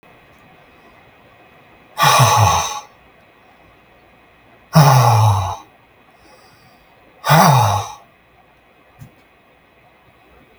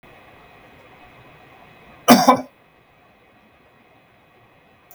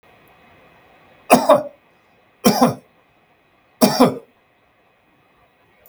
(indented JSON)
{
  "exhalation_length": "10.6 s",
  "exhalation_amplitude": 32768,
  "exhalation_signal_mean_std_ratio": 0.39,
  "cough_length": "4.9 s",
  "cough_amplitude": 32768,
  "cough_signal_mean_std_ratio": 0.21,
  "three_cough_length": "5.9 s",
  "three_cough_amplitude": 32768,
  "three_cough_signal_mean_std_ratio": 0.3,
  "survey_phase": "beta (2021-08-13 to 2022-03-07)",
  "age": "65+",
  "gender": "Male",
  "wearing_mask": "No",
  "symptom_none": true,
  "smoker_status": "Never smoked",
  "respiratory_condition_asthma": true,
  "respiratory_condition_other": false,
  "recruitment_source": "REACT",
  "submission_delay": "5 days",
  "covid_test_result": "Negative",
  "covid_test_method": "RT-qPCR",
  "influenza_a_test_result": "Negative",
  "influenza_b_test_result": "Negative"
}